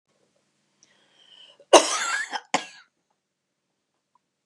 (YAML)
cough_length: 4.5 s
cough_amplitude: 32766
cough_signal_mean_std_ratio: 0.22
survey_phase: beta (2021-08-13 to 2022-03-07)
age: 65+
gender: Female
wearing_mask: 'No'
symptom_none: true
smoker_status: Never smoked
respiratory_condition_asthma: false
respiratory_condition_other: false
recruitment_source: REACT
submission_delay: 0 days
covid_test_result: Negative
covid_test_method: RT-qPCR